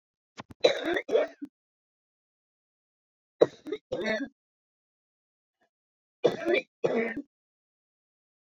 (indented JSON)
{
  "three_cough_length": "8.5 s",
  "three_cough_amplitude": 15629,
  "three_cough_signal_mean_std_ratio": 0.31,
  "survey_phase": "beta (2021-08-13 to 2022-03-07)",
  "age": "65+",
  "gender": "Female",
  "wearing_mask": "No",
  "symptom_cough_any": true,
  "symptom_fatigue": true,
  "smoker_status": "Never smoked",
  "respiratory_condition_asthma": true,
  "respiratory_condition_other": false,
  "recruitment_source": "REACT",
  "submission_delay": "2 days",
  "covid_test_result": "Negative",
  "covid_test_method": "RT-qPCR"
}